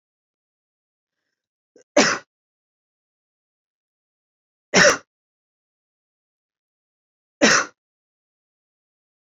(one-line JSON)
{"three_cough_length": "9.4 s", "three_cough_amplitude": 28644, "three_cough_signal_mean_std_ratio": 0.2, "survey_phase": "beta (2021-08-13 to 2022-03-07)", "age": "18-44", "gender": "Female", "wearing_mask": "No", "symptom_none": true, "smoker_status": "Never smoked", "respiratory_condition_asthma": false, "respiratory_condition_other": false, "recruitment_source": "REACT", "submission_delay": "1 day", "covid_test_result": "Negative", "covid_test_method": "RT-qPCR"}